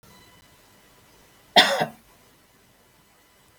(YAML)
cough_length: 3.6 s
cough_amplitude: 30718
cough_signal_mean_std_ratio: 0.22
survey_phase: beta (2021-08-13 to 2022-03-07)
age: 65+
gender: Female
wearing_mask: 'No'
symptom_none: true
smoker_status: Ex-smoker
respiratory_condition_asthma: false
respiratory_condition_other: false
recruitment_source: Test and Trace
submission_delay: 0 days
covid_test_result: Negative
covid_test_method: LFT